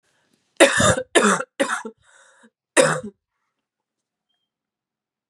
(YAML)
cough_length: 5.3 s
cough_amplitude: 32767
cough_signal_mean_std_ratio: 0.34
survey_phase: beta (2021-08-13 to 2022-03-07)
age: 45-64
gender: Female
wearing_mask: 'Yes'
symptom_runny_or_blocked_nose: true
symptom_shortness_of_breath: true
symptom_sore_throat: true
symptom_fatigue: true
symptom_onset: 5 days
smoker_status: Never smoked
respiratory_condition_asthma: false
respiratory_condition_other: false
recruitment_source: Test and Trace
submission_delay: 2 days
covid_test_result: Positive
covid_test_method: ePCR